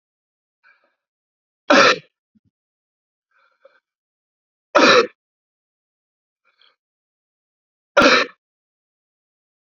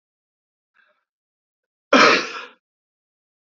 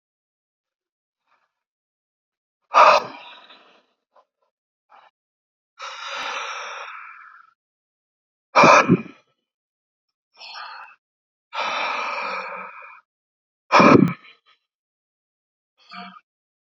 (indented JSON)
{
  "three_cough_length": "9.6 s",
  "three_cough_amplitude": 31652,
  "three_cough_signal_mean_std_ratio": 0.24,
  "cough_length": "3.5 s",
  "cough_amplitude": 30789,
  "cough_signal_mean_std_ratio": 0.25,
  "exhalation_length": "16.7 s",
  "exhalation_amplitude": 29282,
  "exhalation_signal_mean_std_ratio": 0.27,
  "survey_phase": "beta (2021-08-13 to 2022-03-07)",
  "age": "45-64",
  "gender": "Male",
  "wearing_mask": "No",
  "symptom_none": true,
  "symptom_onset": "12 days",
  "smoker_status": "Never smoked",
  "respiratory_condition_asthma": false,
  "respiratory_condition_other": false,
  "recruitment_source": "REACT",
  "submission_delay": "11 days",
  "covid_test_result": "Positive",
  "covid_test_method": "RT-qPCR",
  "covid_ct_value": 33.0,
  "covid_ct_gene": "N gene"
}